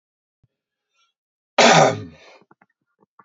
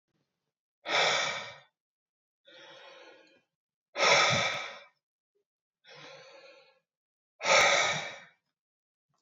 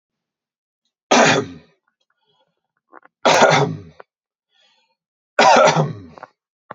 {"cough_length": "3.2 s", "cough_amplitude": 30185, "cough_signal_mean_std_ratio": 0.28, "exhalation_length": "9.2 s", "exhalation_amplitude": 9608, "exhalation_signal_mean_std_ratio": 0.37, "three_cough_length": "6.7 s", "three_cough_amplitude": 32768, "three_cough_signal_mean_std_ratio": 0.37, "survey_phase": "alpha (2021-03-01 to 2021-08-12)", "age": "18-44", "gender": "Male", "wearing_mask": "No", "symptom_none": true, "smoker_status": "Never smoked", "respiratory_condition_asthma": false, "respiratory_condition_other": false, "recruitment_source": "REACT", "submission_delay": "1 day", "covid_test_result": "Negative", "covid_test_method": "RT-qPCR"}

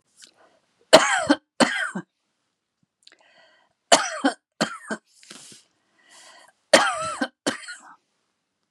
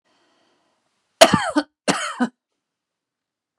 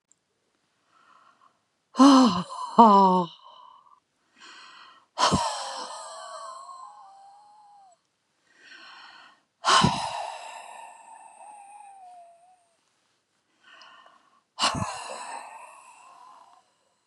{"three_cough_length": "8.7 s", "three_cough_amplitude": 32768, "three_cough_signal_mean_std_ratio": 0.3, "cough_length": "3.6 s", "cough_amplitude": 32768, "cough_signal_mean_std_ratio": 0.26, "exhalation_length": "17.1 s", "exhalation_amplitude": 25355, "exhalation_signal_mean_std_ratio": 0.31, "survey_phase": "beta (2021-08-13 to 2022-03-07)", "age": "65+", "gender": "Female", "wearing_mask": "No", "symptom_none": true, "symptom_onset": "4 days", "smoker_status": "Ex-smoker", "respiratory_condition_asthma": false, "respiratory_condition_other": true, "recruitment_source": "REACT", "submission_delay": "3 days", "covid_test_result": "Negative", "covid_test_method": "RT-qPCR", "influenza_a_test_result": "Negative", "influenza_b_test_result": "Negative"}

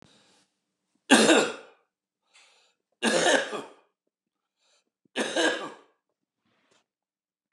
{"three_cough_length": "7.5 s", "three_cough_amplitude": 20406, "three_cough_signal_mean_std_ratio": 0.32, "survey_phase": "beta (2021-08-13 to 2022-03-07)", "age": "65+", "gender": "Male", "wearing_mask": "No", "symptom_cough_any": true, "symptom_runny_or_blocked_nose": true, "symptom_sore_throat": true, "symptom_headache": true, "smoker_status": "Ex-smoker", "respiratory_condition_asthma": false, "respiratory_condition_other": false, "recruitment_source": "REACT", "submission_delay": "2 days", "covid_test_result": "Negative", "covid_test_method": "RT-qPCR", "influenza_a_test_result": "Negative", "influenza_b_test_result": "Negative"}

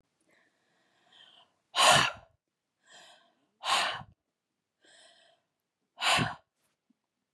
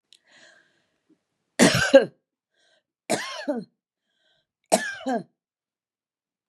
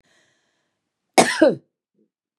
{"exhalation_length": "7.3 s", "exhalation_amplitude": 12574, "exhalation_signal_mean_std_ratio": 0.28, "three_cough_length": "6.5 s", "three_cough_amplitude": 29329, "three_cough_signal_mean_std_ratio": 0.27, "cough_length": "2.4 s", "cough_amplitude": 32627, "cough_signal_mean_std_ratio": 0.27, "survey_phase": "beta (2021-08-13 to 2022-03-07)", "age": "45-64", "gender": "Female", "wearing_mask": "No", "symptom_headache": true, "smoker_status": "Never smoked", "respiratory_condition_asthma": false, "respiratory_condition_other": false, "recruitment_source": "REACT", "submission_delay": "1 day", "covid_test_result": "Negative", "covid_test_method": "RT-qPCR", "influenza_a_test_result": "Negative", "influenza_b_test_result": "Negative"}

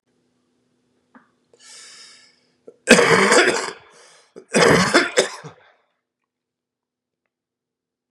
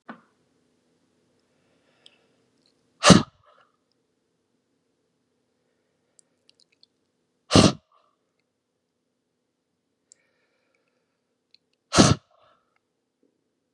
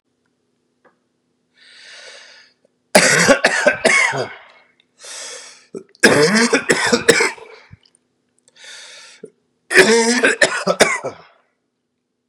{"cough_length": "8.1 s", "cough_amplitude": 32768, "cough_signal_mean_std_ratio": 0.34, "exhalation_length": "13.7 s", "exhalation_amplitude": 32768, "exhalation_signal_mean_std_ratio": 0.15, "three_cough_length": "12.3 s", "three_cough_amplitude": 32768, "three_cough_signal_mean_std_ratio": 0.43, "survey_phase": "beta (2021-08-13 to 2022-03-07)", "age": "18-44", "gender": "Male", "wearing_mask": "No", "symptom_cough_any": true, "symptom_fatigue": true, "symptom_onset": "4 days", "smoker_status": "Current smoker (1 to 10 cigarettes per day)", "respiratory_condition_asthma": false, "respiratory_condition_other": false, "recruitment_source": "Test and Trace", "submission_delay": "1 day", "covid_test_result": "Positive", "covid_test_method": "RT-qPCR", "covid_ct_value": 22.5, "covid_ct_gene": "N gene"}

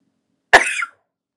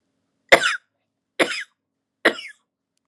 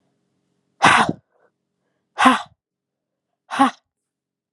{"cough_length": "1.4 s", "cough_amplitude": 32768, "cough_signal_mean_std_ratio": 0.28, "three_cough_length": "3.1 s", "three_cough_amplitude": 32768, "three_cough_signal_mean_std_ratio": 0.26, "exhalation_length": "4.5 s", "exhalation_amplitude": 32070, "exhalation_signal_mean_std_ratio": 0.29, "survey_phase": "beta (2021-08-13 to 2022-03-07)", "age": "18-44", "gender": "Female", "wearing_mask": "No", "symptom_runny_or_blocked_nose": true, "symptom_shortness_of_breath": true, "symptom_sore_throat": true, "symptom_onset": "4 days", "smoker_status": "Never smoked", "respiratory_condition_asthma": false, "respiratory_condition_other": false, "recruitment_source": "Test and Trace", "submission_delay": "3 days", "covid_test_result": "Positive", "covid_test_method": "RT-qPCR", "covid_ct_value": 30.0, "covid_ct_gene": "N gene"}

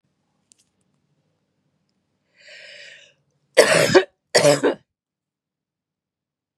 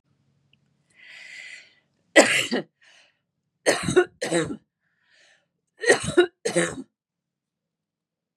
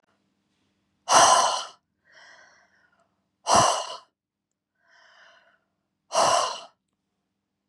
{"cough_length": "6.6 s", "cough_amplitude": 32768, "cough_signal_mean_std_ratio": 0.27, "three_cough_length": "8.4 s", "three_cough_amplitude": 32045, "three_cough_signal_mean_std_ratio": 0.32, "exhalation_length": "7.7 s", "exhalation_amplitude": 25742, "exhalation_signal_mean_std_ratio": 0.33, "survey_phase": "beta (2021-08-13 to 2022-03-07)", "age": "45-64", "gender": "Female", "wearing_mask": "No", "symptom_cough_any": true, "symptom_other": true, "smoker_status": "Never smoked", "respiratory_condition_asthma": false, "respiratory_condition_other": false, "recruitment_source": "Test and Trace", "submission_delay": "1 day", "covid_test_result": "Positive", "covid_test_method": "RT-qPCR"}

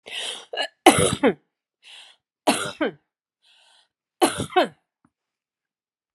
{"cough_length": "6.1 s", "cough_amplitude": 32768, "cough_signal_mean_std_ratio": 0.32, "survey_phase": "alpha (2021-03-01 to 2021-08-12)", "age": "65+", "gender": "Female", "wearing_mask": "No", "symptom_none": true, "smoker_status": "Ex-smoker", "respiratory_condition_asthma": false, "respiratory_condition_other": false, "recruitment_source": "REACT", "submission_delay": "3 days", "covid_test_result": "Negative", "covid_test_method": "RT-qPCR"}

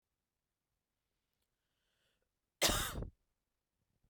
{"cough_length": "4.1 s", "cough_amplitude": 4466, "cough_signal_mean_std_ratio": 0.23, "survey_phase": "beta (2021-08-13 to 2022-03-07)", "age": "18-44", "gender": "Female", "wearing_mask": "No", "symptom_cough_any": true, "symptom_runny_or_blocked_nose": true, "symptom_sore_throat": true, "symptom_headache": true, "symptom_onset": "2 days", "smoker_status": "Never smoked", "respiratory_condition_asthma": false, "respiratory_condition_other": false, "recruitment_source": "Test and Trace", "submission_delay": "1 day", "covid_test_result": "Positive", "covid_test_method": "RT-qPCR"}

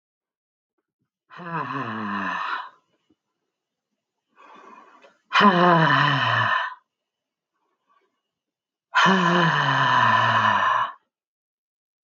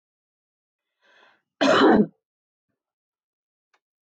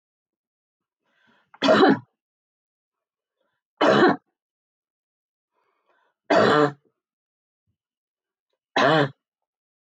{"exhalation_length": "12.0 s", "exhalation_amplitude": 23575, "exhalation_signal_mean_std_ratio": 0.5, "cough_length": "4.0 s", "cough_amplitude": 17395, "cough_signal_mean_std_ratio": 0.28, "three_cough_length": "10.0 s", "three_cough_amplitude": 20230, "three_cough_signal_mean_std_ratio": 0.3, "survey_phase": "beta (2021-08-13 to 2022-03-07)", "age": "45-64", "gender": "Female", "wearing_mask": "No", "symptom_other": true, "smoker_status": "Never smoked", "respiratory_condition_asthma": false, "respiratory_condition_other": false, "recruitment_source": "Test and Trace", "submission_delay": "0 days", "covid_test_result": "Negative", "covid_test_method": "RT-qPCR"}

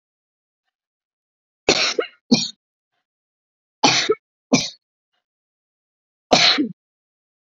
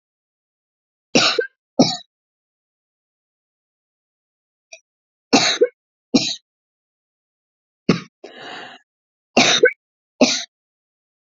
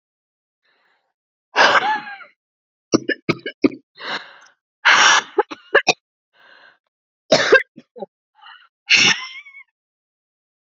{"cough_length": "7.5 s", "cough_amplitude": 32768, "cough_signal_mean_std_ratio": 0.31, "three_cough_length": "11.3 s", "three_cough_amplitude": 29794, "three_cough_signal_mean_std_ratio": 0.28, "exhalation_length": "10.8 s", "exhalation_amplitude": 31940, "exhalation_signal_mean_std_ratio": 0.33, "survey_phase": "beta (2021-08-13 to 2022-03-07)", "age": "45-64", "gender": "Female", "wearing_mask": "No", "symptom_cough_any": true, "symptom_shortness_of_breath": true, "symptom_abdominal_pain": true, "symptom_fatigue": true, "symptom_headache": true, "smoker_status": "Ex-smoker", "respiratory_condition_asthma": true, "respiratory_condition_other": true, "recruitment_source": "REACT", "submission_delay": "1 day", "covid_test_result": "Negative", "covid_test_method": "RT-qPCR"}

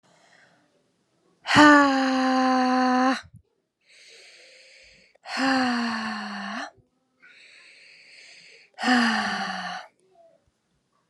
{"exhalation_length": "11.1 s", "exhalation_amplitude": 30371, "exhalation_signal_mean_std_ratio": 0.43, "survey_phase": "alpha (2021-03-01 to 2021-08-12)", "age": "18-44", "gender": "Female", "wearing_mask": "No", "symptom_shortness_of_breath": true, "symptom_abdominal_pain": true, "symptom_fatigue": true, "symptom_fever_high_temperature": true, "symptom_headache": true, "symptom_change_to_sense_of_smell_or_taste": true, "symptom_loss_of_taste": true, "symptom_onset": "3 days", "smoker_status": "Never smoked", "respiratory_condition_asthma": false, "respiratory_condition_other": false, "recruitment_source": "Test and Trace", "submission_delay": "2 days", "covid_test_result": "Positive", "covid_test_method": "RT-qPCR", "covid_ct_value": 16.5, "covid_ct_gene": "ORF1ab gene", "covid_ct_mean": 16.7, "covid_viral_load": "3300000 copies/ml", "covid_viral_load_category": "High viral load (>1M copies/ml)"}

